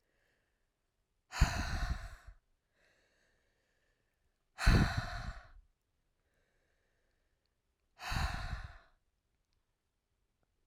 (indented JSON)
{
  "exhalation_length": "10.7 s",
  "exhalation_amplitude": 6526,
  "exhalation_signal_mean_std_ratio": 0.29,
  "survey_phase": "alpha (2021-03-01 to 2021-08-12)",
  "age": "18-44",
  "gender": "Female",
  "wearing_mask": "No",
  "symptom_cough_any": true,
  "symptom_new_continuous_cough": true,
  "symptom_fatigue": true,
  "symptom_fever_high_temperature": true,
  "symptom_change_to_sense_of_smell_or_taste": true,
  "symptom_loss_of_taste": true,
  "symptom_onset": "4 days",
  "smoker_status": "Never smoked",
  "respiratory_condition_asthma": false,
  "respiratory_condition_other": false,
  "recruitment_source": "Test and Trace",
  "submission_delay": "2 days",
  "covid_test_result": "Positive",
  "covid_test_method": "RT-qPCR"
}